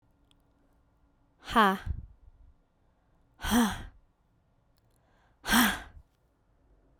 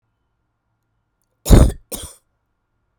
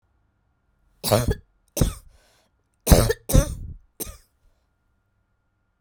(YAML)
exhalation_length: 7.0 s
exhalation_amplitude: 10756
exhalation_signal_mean_std_ratio: 0.31
cough_length: 3.0 s
cough_amplitude: 32768
cough_signal_mean_std_ratio: 0.23
three_cough_length: 5.8 s
three_cough_amplitude: 32767
three_cough_signal_mean_std_ratio: 0.29
survey_phase: beta (2021-08-13 to 2022-03-07)
age: 18-44
gender: Female
wearing_mask: 'No'
symptom_none: true
symptom_onset: 10 days
smoker_status: Never smoked
respiratory_condition_asthma: false
respiratory_condition_other: false
recruitment_source: REACT
submission_delay: 0 days
covid_test_result: Negative
covid_test_method: RT-qPCR